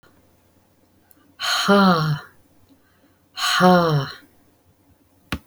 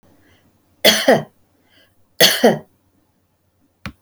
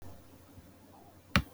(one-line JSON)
{"exhalation_length": "5.5 s", "exhalation_amplitude": 23559, "exhalation_signal_mean_std_ratio": 0.44, "three_cough_length": "4.0 s", "three_cough_amplitude": 31608, "three_cough_signal_mean_std_ratio": 0.32, "cough_length": "1.5 s", "cough_amplitude": 13583, "cough_signal_mean_std_ratio": 0.27, "survey_phase": "beta (2021-08-13 to 2022-03-07)", "age": "65+", "gender": "Female", "wearing_mask": "No", "symptom_none": true, "smoker_status": "Never smoked", "respiratory_condition_asthma": false, "respiratory_condition_other": false, "recruitment_source": "REACT", "submission_delay": "6 days", "covid_test_result": "Negative", "covid_test_method": "RT-qPCR"}